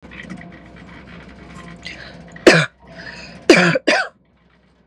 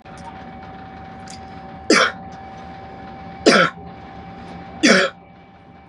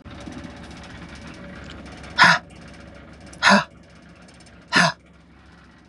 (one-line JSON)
{"cough_length": "4.9 s", "cough_amplitude": 32768, "cough_signal_mean_std_ratio": 0.35, "three_cough_length": "5.9 s", "three_cough_amplitude": 32656, "three_cough_signal_mean_std_ratio": 0.41, "exhalation_length": "5.9 s", "exhalation_amplitude": 31011, "exhalation_signal_mean_std_ratio": 0.34, "survey_phase": "beta (2021-08-13 to 2022-03-07)", "age": "18-44", "gender": "Female", "wearing_mask": "Yes", "symptom_none": true, "smoker_status": "Ex-smoker", "respiratory_condition_asthma": false, "respiratory_condition_other": false, "recruitment_source": "REACT", "submission_delay": "1 day", "covid_test_result": "Negative", "covid_test_method": "RT-qPCR", "influenza_a_test_result": "Negative", "influenza_b_test_result": "Negative"}